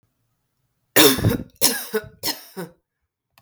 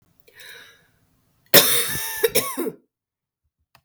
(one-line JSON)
{"three_cough_length": "3.4 s", "three_cough_amplitude": 32768, "three_cough_signal_mean_std_ratio": 0.36, "cough_length": "3.8 s", "cough_amplitude": 32766, "cough_signal_mean_std_ratio": 0.34, "survey_phase": "beta (2021-08-13 to 2022-03-07)", "age": "18-44", "gender": "Female", "wearing_mask": "No", "symptom_cough_any": true, "symptom_runny_or_blocked_nose": true, "symptom_shortness_of_breath": true, "symptom_sore_throat": true, "symptom_fatigue": true, "symptom_headache": true, "symptom_onset": "3 days", "smoker_status": "Ex-smoker", "respiratory_condition_asthma": false, "respiratory_condition_other": false, "recruitment_source": "Test and Trace", "submission_delay": "2 days", "covid_test_result": "Negative", "covid_test_method": "RT-qPCR"}